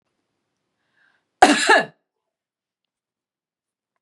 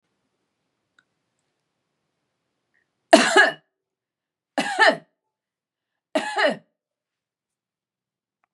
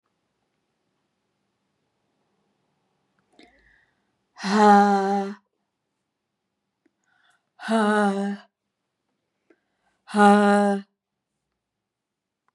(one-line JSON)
{"cough_length": "4.0 s", "cough_amplitude": 32767, "cough_signal_mean_std_ratio": 0.23, "three_cough_length": "8.5 s", "three_cough_amplitude": 32642, "three_cough_signal_mean_std_ratio": 0.24, "exhalation_length": "12.5 s", "exhalation_amplitude": 26359, "exhalation_signal_mean_std_ratio": 0.31, "survey_phase": "beta (2021-08-13 to 2022-03-07)", "age": "45-64", "gender": "Female", "wearing_mask": "Yes", "symptom_none": true, "smoker_status": "Never smoked", "respiratory_condition_asthma": false, "respiratory_condition_other": false, "recruitment_source": "REACT", "submission_delay": "2 days", "covid_test_result": "Negative", "covid_test_method": "RT-qPCR", "influenza_a_test_result": "Unknown/Void", "influenza_b_test_result": "Unknown/Void"}